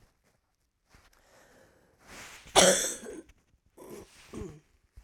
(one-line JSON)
{"cough_length": "5.0 s", "cough_amplitude": 20054, "cough_signal_mean_std_ratio": 0.26, "survey_phase": "alpha (2021-03-01 to 2021-08-12)", "age": "65+", "gender": "Female", "wearing_mask": "No", "symptom_cough_any": true, "symptom_new_continuous_cough": true, "symptom_fatigue": true, "symptom_headache": true, "smoker_status": "Never smoked", "respiratory_condition_asthma": true, "respiratory_condition_other": false, "recruitment_source": "Test and Trace", "submission_delay": "2 days", "covid_test_result": "Positive", "covid_test_method": "RT-qPCR"}